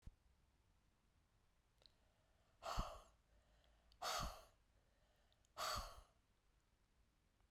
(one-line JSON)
{"exhalation_length": "7.5 s", "exhalation_amplitude": 1019, "exhalation_signal_mean_std_ratio": 0.35, "survey_phase": "beta (2021-08-13 to 2022-03-07)", "age": "45-64", "gender": "Female", "wearing_mask": "No", "symptom_runny_or_blocked_nose": true, "symptom_fatigue": true, "symptom_fever_high_temperature": true, "symptom_headache": true, "symptom_onset": "4 days", "smoker_status": "Never smoked", "respiratory_condition_asthma": false, "respiratory_condition_other": false, "recruitment_source": "Test and Trace", "submission_delay": "2 days", "covid_test_result": "Positive", "covid_test_method": "RT-qPCR", "covid_ct_value": 19.2, "covid_ct_gene": "ORF1ab gene", "covid_ct_mean": 20.1, "covid_viral_load": "260000 copies/ml", "covid_viral_load_category": "Low viral load (10K-1M copies/ml)"}